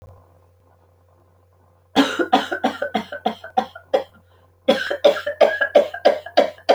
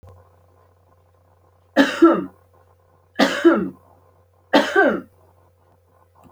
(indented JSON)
{
  "cough_length": "6.7 s",
  "cough_amplitude": 27061,
  "cough_signal_mean_std_ratio": 0.43,
  "three_cough_length": "6.3 s",
  "three_cough_amplitude": 27615,
  "three_cough_signal_mean_std_ratio": 0.35,
  "survey_phase": "alpha (2021-03-01 to 2021-08-12)",
  "age": "45-64",
  "gender": "Female",
  "wearing_mask": "No",
  "symptom_none": true,
  "smoker_status": "Never smoked",
  "respiratory_condition_asthma": false,
  "respiratory_condition_other": false,
  "recruitment_source": "REACT",
  "submission_delay": "13 days",
  "covid_test_result": "Negative",
  "covid_test_method": "RT-qPCR"
}